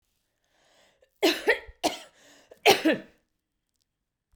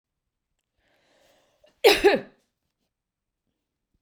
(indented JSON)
{
  "three_cough_length": "4.4 s",
  "three_cough_amplitude": 22242,
  "three_cough_signal_mean_std_ratio": 0.29,
  "cough_length": "4.0 s",
  "cough_amplitude": 21027,
  "cough_signal_mean_std_ratio": 0.21,
  "survey_phase": "beta (2021-08-13 to 2022-03-07)",
  "age": "45-64",
  "gender": "Female",
  "wearing_mask": "No",
  "symptom_none": true,
  "smoker_status": "Ex-smoker",
  "respiratory_condition_asthma": true,
  "respiratory_condition_other": false,
  "recruitment_source": "REACT",
  "submission_delay": "1 day",
  "covid_test_result": "Negative",
  "covid_test_method": "RT-qPCR",
  "influenza_a_test_result": "Negative",
  "influenza_b_test_result": "Negative"
}